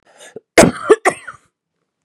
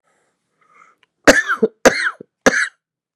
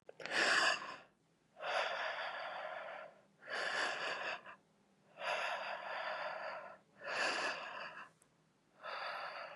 {"cough_length": "2.0 s", "cough_amplitude": 32768, "cough_signal_mean_std_ratio": 0.31, "three_cough_length": "3.2 s", "three_cough_amplitude": 32768, "three_cough_signal_mean_std_ratio": 0.33, "exhalation_length": "9.6 s", "exhalation_amplitude": 3252, "exhalation_signal_mean_std_ratio": 0.68, "survey_phase": "beta (2021-08-13 to 2022-03-07)", "age": "18-44", "gender": "Female", "wearing_mask": "No", "symptom_cough_any": true, "symptom_runny_or_blocked_nose": true, "symptom_abdominal_pain": true, "symptom_headache": true, "symptom_change_to_sense_of_smell_or_taste": true, "symptom_loss_of_taste": true, "symptom_onset": "5 days", "smoker_status": "Current smoker (1 to 10 cigarettes per day)", "respiratory_condition_asthma": false, "respiratory_condition_other": false, "recruitment_source": "Test and Trace", "submission_delay": "2 days", "covid_test_result": "Positive", "covid_test_method": "RT-qPCR", "covid_ct_value": 12.3, "covid_ct_gene": "ORF1ab gene", "covid_ct_mean": 12.6, "covid_viral_load": "74000000 copies/ml", "covid_viral_load_category": "High viral load (>1M copies/ml)"}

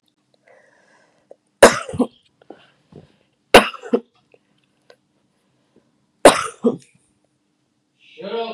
{"three_cough_length": "8.5 s", "three_cough_amplitude": 32768, "three_cough_signal_mean_std_ratio": 0.21, "survey_phase": "beta (2021-08-13 to 2022-03-07)", "age": "45-64", "gender": "Female", "wearing_mask": "No", "symptom_none": true, "smoker_status": "Never smoked", "respiratory_condition_asthma": false, "respiratory_condition_other": false, "recruitment_source": "REACT", "submission_delay": "1 day", "covid_test_result": "Negative", "covid_test_method": "RT-qPCR", "influenza_a_test_result": "Negative", "influenza_b_test_result": "Negative"}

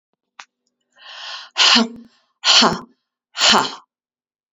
{"exhalation_length": "4.5 s", "exhalation_amplitude": 32767, "exhalation_signal_mean_std_ratio": 0.38, "survey_phase": "beta (2021-08-13 to 2022-03-07)", "age": "45-64", "gender": "Female", "wearing_mask": "No", "symptom_new_continuous_cough": true, "symptom_fatigue": true, "symptom_headache": true, "symptom_onset": "2 days", "smoker_status": "Never smoked", "respiratory_condition_asthma": false, "respiratory_condition_other": false, "recruitment_source": "Test and Trace", "submission_delay": "1 day", "covid_test_result": "Positive", "covid_test_method": "RT-qPCR", "covid_ct_value": 15.8, "covid_ct_gene": "ORF1ab gene", "covid_ct_mean": 15.9, "covid_viral_load": "5900000 copies/ml", "covid_viral_load_category": "High viral load (>1M copies/ml)"}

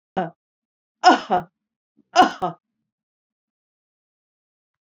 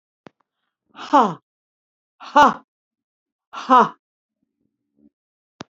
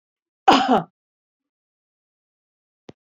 {"three_cough_length": "4.9 s", "three_cough_amplitude": 29046, "three_cough_signal_mean_std_ratio": 0.24, "exhalation_length": "5.7 s", "exhalation_amplitude": 28465, "exhalation_signal_mean_std_ratio": 0.24, "cough_length": "3.1 s", "cough_amplitude": 26610, "cough_signal_mean_std_ratio": 0.24, "survey_phase": "beta (2021-08-13 to 2022-03-07)", "age": "65+", "gender": "Female", "wearing_mask": "No", "symptom_none": true, "smoker_status": "Never smoked", "respiratory_condition_asthma": false, "respiratory_condition_other": false, "recruitment_source": "REACT", "submission_delay": "2 days", "covid_test_result": "Negative", "covid_test_method": "RT-qPCR"}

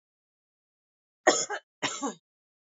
{"cough_length": "2.6 s", "cough_amplitude": 17157, "cough_signal_mean_std_ratio": 0.28, "survey_phase": "alpha (2021-03-01 to 2021-08-12)", "age": "18-44", "gender": "Female", "wearing_mask": "No", "symptom_none": true, "smoker_status": "Current smoker (1 to 10 cigarettes per day)", "respiratory_condition_asthma": true, "respiratory_condition_other": false, "recruitment_source": "REACT", "submission_delay": "2 days", "covid_test_result": "Negative", "covid_test_method": "RT-qPCR"}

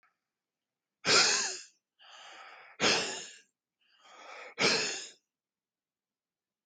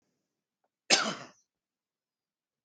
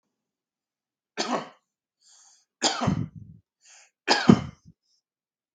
{"exhalation_length": "6.7 s", "exhalation_amplitude": 9652, "exhalation_signal_mean_std_ratio": 0.36, "cough_length": "2.6 s", "cough_amplitude": 15930, "cough_signal_mean_std_ratio": 0.22, "three_cough_length": "5.5 s", "three_cough_amplitude": 31779, "three_cough_signal_mean_std_ratio": 0.27, "survey_phase": "beta (2021-08-13 to 2022-03-07)", "age": "45-64", "gender": "Male", "wearing_mask": "No", "symptom_runny_or_blocked_nose": true, "symptom_headache": true, "smoker_status": "Never smoked", "respiratory_condition_asthma": false, "respiratory_condition_other": false, "recruitment_source": "REACT", "submission_delay": "2 days", "covid_test_result": "Negative", "covid_test_method": "RT-qPCR", "influenza_a_test_result": "Negative", "influenza_b_test_result": "Negative"}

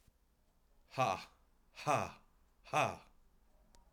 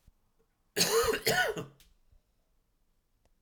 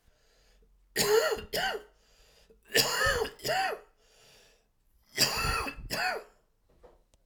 {"exhalation_length": "3.9 s", "exhalation_amplitude": 3427, "exhalation_signal_mean_std_ratio": 0.35, "cough_length": "3.4 s", "cough_amplitude": 8034, "cough_signal_mean_std_ratio": 0.4, "three_cough_length": "7.3 s", "three_cough_amplitude": 12141, "three_cough_signal_mean_std_ratio": 0.49, "survey_phase": "alpha (2021-03-01 to 2021-08-12)", "age": "45-64", "gender": "Male", "wearing_mask": "No", "symptom_cough_any": true, "symptom_fatigue": true, "symptom_fever_high_temperature": true, "symptom_headache": true, "smoker_status": "Never smoked", "respiratory_condition_asthma": false, "respiratory_condition_other": false, "recruitment_source": "Test and Trace", "submission_delay": "2 days", "covid_test_result": "Positive", "covid_test_method": "RT-qPCR", "covid_ct_value": 14.0, "covid_ct_gene": "ORF1ab gene", "covid_ct_mean": 14.8, "covid_viral_load": "14000000 copies/ml", "covid_viral_load_category": "High viral load (>1M copies/ml)"}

